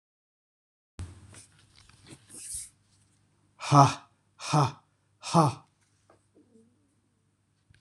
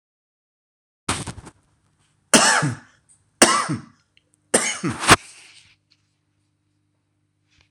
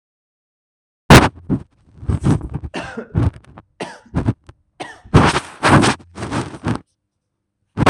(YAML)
exhalation_length: 7.8 s
exhalation_amplitude: 23721
exhalation_signal_mean_std_ratio: 0.25
cough_length: 7.7 s
cough_amplitude: 26028
cough_signal_mean_std_ratio: 0.3
three_cough_length: 7.9 s
three_cough_amplitude: 26028
three_cough_signal_mean_std_ratio: 0.39
survey_phase: alpha (2021-03-01 to 2021-08-12)
age: 45-64
gender: Male
wearing_mask: 'No'
symptom_none: true
smoker_status: Never smoked
respiratory_condition_asthma: false
respiratory_condition_other: false
recruitment_source: REACT
submission_delay: 5 days
covid_test_result: Negative
covid_test_method: RT-qPCR